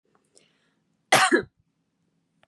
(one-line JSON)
{"cough_length": "2.5 s", "cough_amplitude": 21384, "cough_signal_mean_std_ratio": 0.26, "survey_phase": "beta (2021-08-13 to 2022-03-07)", "age": "18-44", "gender": "Female", "wearing_mask": "No", "symptom_none": true, "smoker_status": "Prefer not to say", "respiratory_condition_asthma": false, "respiratory_condition_other": false, "recruitment_source": "REACT", "submission_delay": "3 days", "covid_test_result": "Negative", "covid_test_method": "RT-qPCR", "influenza_a_test_result": "Negative", "influenza_b_test_result": "Negative"}